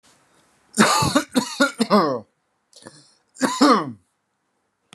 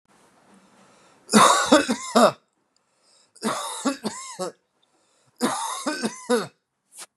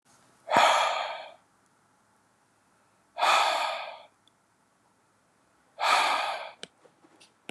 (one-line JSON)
{"cough_length": "4.9 s", "cough_amplitude": 29215, "cough_signal_mean_std_ratio": 0.43, "three_cough_length": "7.2 s", "three_cough_amplitude": 32469, "three_cough_signal_mean_std_ratio": 0.39, "exhalation_length": "7.5 s", "exhalation_amplitude": 19572, "exhalation_signal_mean_std_ratio": 0.41, "survey_phase": "beta (2021-08-13 to 2022-03-07)", "age": "45-64", "gender": "Male", "wearing_mask": "No", "symptom_none": true, "smoker_status": "Ex-smoker", "respiratory_condition_asthma": false, "respiratory_condition_other": false, "recruitment_source": "REACT", "submission_delay": "3 days", "covid_test_result": "Negative", "covid_test_method": "RT-qPCR", "influenza_a_test_result": "Negative", "influenza_b_test_result": "Negative"}